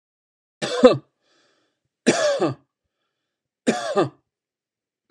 {
  "three_cough_length": "5.1 s",
  "three_cough_amplitude": 32767,
  "three_cough_signal_mean_std_ratio": 0.32,
  "survey_phase": "beta (2021-08-13 to 2022-03-07)",
  "age": "45-64",
  "gender": "Male",
  "wearing_mask": "No",
  "symptom_none": true,
  "smoker_status": "Never smoked",
  "respiratory_condition_asthma": false,
  "respiratory_condition_other": false,
  "recruitment_source": "REACT",
  "submission_delay": "2 days",
  "covid_test_result": "Negative",
  "covid_test_method": "RT-qPCR"
}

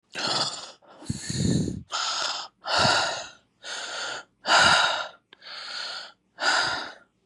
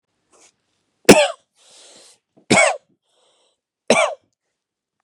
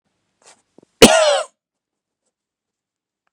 {
  "exhalation_length": "7.3 s",
  "exhalation_amplitude": 17325,
  "exhalation_signal_mean_std_ratio": 0.6,
  "three_cough_length": "5.0 s",
  "three_cough_amplitude": 32768,
  "three_cough_signal_mean_std_ratio": 0.27,
  "cough_length": "3.3 s",
  "cough_amplitude": 32768,
  "cough_signal_mean_std_ratio": 0.25,
  "survey_phase": "beta (2021-08-13 to 2022-03-07)",
  "age": "18-44",
  "gender": "Male",
  "wearing_mask": "Yes",
  "symptom_sore_throat": true,
  "symptom_change_to_sense_of_smell_or_taste": true,
  "smoker_status": "Never smoked",
  "respiratory_condition_asthma": true,
  "respiratory_condition_other": false,
  "recruitment_source": "Test and Trace",
  "submission_delay": "1 day",
  "covid_test_result": "Positive",
  "covid_test_method": "LFT"
}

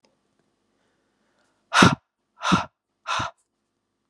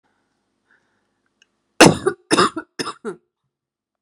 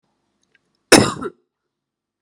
{
  "exhalation_length": "4.1 s",
  "exhalation_amplitude": 32619,
  "exhalation_signal_mean_std_ratio": 0.26,
  "three_cough_length": "4.0 s",
  "three_cough_amplitude": 32768,
  "three_cough_signal_mean_std_ratio": 0.25,
  "cough_length": "2.2 s",
  "cough_amplitude": 32768,
  "cough_signal_mean_std_ratio": 0.23,
  "survey_phase": "beta (2021-08-13 to 2022-03-07)",
  "age": "18-44",
  "gender": "Female",
  "wearing_mask": "No",
  "symptom_cough_any": true,
  "symptom_runny_or_blocked_nose": true,
  "symptom_shortness_of_breath": true,
  "symptom_sore_throat": true,
  "symptom_fatigue": true,
  "symptom_fever_high_temperature": true,
  "symptom_headache": true,
  "symptom_other": true,
  "symptom_onset": "4 days",
  "smoker_status": "Never smoked",
  "respiratory_condition_asthma": false,
  "respiratory_condition_other": false,
  "recruitment_source": "Test and Trace",
  "submission_delay": "2 days",
  "covid_test_result": "Positive",
  "covid_test_method": "RT-qPCR",
  "covid_ct_value": 17.1,
  "covid_ct_gene": "ORF1ab gene",
  "covid_ct_mean": 17.7,
  "covid_viral_load": "1600000 copies/ml",
  "covid_viral_load_category": "High viral load (>1M copies/ml)"
}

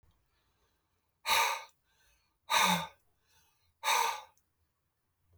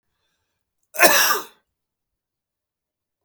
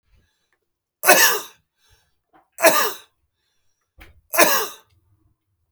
{
  "exhalation_length": "5.4 s",
  "exhalation_amplitude": 6253,
  "exhalation_signal_mean_std_ratio": 0.35,
  "cough_length": "3.2 s",
  "cough_amplitude": 32768,
  "cough_signal_mean_std_ratio": 0.27,
  "three_cough_length": "5.7 s",
  "three_cough_amplitude": 32768,
  "three_cough_signal_mean_std_ratio": 0.32,
  "survey_phase": "beta (2021-08-13 to 2022-03-07)",
  "age": "45-64",
  "gender": "Male",
  "wearing_mask": "No",
  "symptom_none": true,
  "smoker_status": "Ex-smoker",
  "respiratory_condition_asthma": false,
  "respiratory_condition_other": false,
  "recruitment_source": "REACT",
  "submission_delay": "1 day",
  "covid_test_result": "Negative",
  "covid_test_method": "RT-qPCR",
  "influenza_a_test_result": "Unknown/Void",
  "influenza_b_test_result": "Unknown/Void"
}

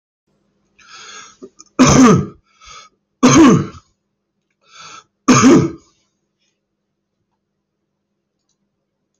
{
  "three_cough_length": "9.2 s",
  "three_cough_amplitude": 31463,
  "three_cough_signal_mean_std_ratio": 0.33,
  "survey_phase": "alpha (2021-03-01 to 2021-08-12)",
  "age": "45-64",
  "gender": "Male",
  "wearing_mask": "No",
  "symptom_none": true,
  "smoker_status": "Ex-smoker",
  "respiratory_condition_asthma": false,
  "respiratory_condition_other": false,
  "recruitment_source": "REACT",
  "submission_delay": "5 days",
  "covid_test_result": "Negative",
  "covid_test_method": "RT-qPCR"
}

